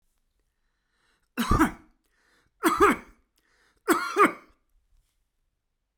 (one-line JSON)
{"three_cough_length": "6.0 s", "three_cough_amplitude": 15533, "three_cough_signal_mean_std_ratio": 0.31, "survey_phase": "beta (2021-08-13 to 2022-03-07)", "age": "65+", "gender": "Male", "wearing_mask": "No", "symptom_none": true, "smoker_status": "Ex-smoker", "respiratory_condition_asthma": false, "respiratory_condition_other": false, "recruitment_source": "REACT", "submission_delay": "1 day", "covid_test_result": "Negative", "covid_test_method": "RT-qPCR"}